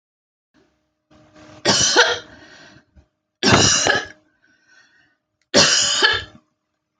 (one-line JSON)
{"three_cough_length": "7.0 s", "three_cough_amplitude": 29526, "three_cough_signal_mean_std_ratio": 0.42, "survey_phase": "alpha (2021-03-01 to 2021-08-12)", "age": "18-44", "gender": "Female", "wearing_mask": "No", "symptom_none": true, "symptom_onset": "12 days", "smoker_status": "Ex-smoker", "respiratory_condition_asthma": false, "respiratory_condition_other": true, "recruitment_source": "REACT", "submission_delay": "1 day", "covid_test_result": "Negative", "covid_test_method": "RT-qPCR"}